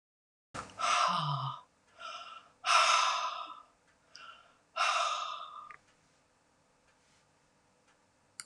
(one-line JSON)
{"exhalation_length": "8.5 s", "exhalation_amplitude": 6969, "exhalation_signal_mean_std_ratio": 0.44, "survey_phase": "beta (2021-08-13 to 2022-03-07)", "age": "65+", "gender": "Female", "wearing_mask": "No", "symptom_none": true, "smoker_status": "Never smoked", "respiratory_condition_asthma": false, "respiratory_condition_other": false, "recruitment_source": "REACT", "submission_delay": "1 day", "covid_test_result": "Negative", "covid_test_method": "RT-qPCR"}